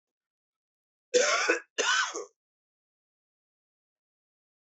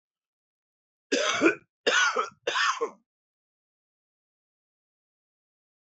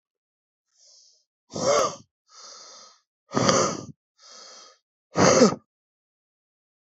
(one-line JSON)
{"cough_length": "4.6 s", "cough_amplitude": 9575, "cough_signal_mean_std_ratio": 0.34, "three_cough_length": "5.8 s", "three_cough_amplitude": 13636, "three_cough_signal_mean_std_ratio": 0.36, "exhalation_length": "6.9 s", "exhalation_amplitude": 30083, "exhalation_signal_mean_std_ratio": 0.33, "survey_phase": "alpha (2021-03-01 to 2021-08-12)", "age": "45-64", "gender": "Male", "wearing_mask": "No", "symptom_cough_any": true, "symptom_fatigue": true, "symptom_fever_high_temperature": true, "symptom_headache": true, "symptom_change_to_sense_of_smell_or_taste": true, "symptom_onset": "3 days", "smoker_status": "Ex-smoker", "respiratory_condition_asthma": false, "respiratory_condition_other": false, "recruitment_source": "Test and Trace", "submission_delay": "2 days", "covid_test_result": "Positive", "covid_test_method": "RT-qPCR", "covid_ct_value": 16.3, "covid_ct_gene": "ORF1ab gene", "covid_ct_mean": 16.6, "covid_viral_load": "3600000 copies/ml", "covid_viral_load_category": "High viral load (>1M copies/ml)"}